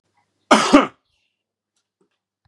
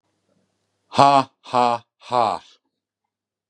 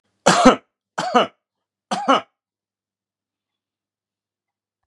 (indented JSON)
{
  "cough_length": "2.5 s",
  "cough_amplitude": 32768,
  "cough_signal_mean_std_ratio": 0.26,
  "exhalation_length": "3.5 s",
  "exhalation_amplitude": 32691,
  "exhalation_signal_mean_std_ratio": 0.32,
  "three_cough_length": "4.9 s",
  "three_cough_amplitude": 32768,
  "three_cough_signal_mean_std_ratio": 0.28,
  "survey_phase": "beta (2021-08-13 to 2022-03-07)",
  "age": "45-64",
  "gender": "Male",
  "wearing_mask": "No",
  "symptom_none": true,
  "smoker_status": "Current smoker (e-cigarettes or vapes only)",
  "respiratory_condition_asthma": false,
  "respiratory_condition_other": false,
  "recruitment_source": "REACT",
  "submission_delay": "1 day",
  "covid_test_result": "Negative",
  "covid_test_method": "RT-qPCR",
  "influenza_a_test_result": "Negative",
  "influenza_b_test_result": "Negative"
}